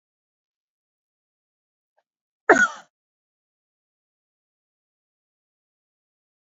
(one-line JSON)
{"cough_length": "6.6 s", "cough_amplitude": 27913, "cough_signal_mean_std_ratio": 0.13, "survey_phase": "alpha (2021-03-01 to 2021-08-12)", "age": "65+", "gender": "Female", "wearing_mask": "No", "symptom_none": true, "smoker_status": "Ex-smoker", "respiratory_condition_asthma": false, "respiratory_condition_other": false, "recruitment_source": "REACT", "submission_delay": "1 day", "covid_test_result": "Negative", "covid_test_method": "RT-qPCR"}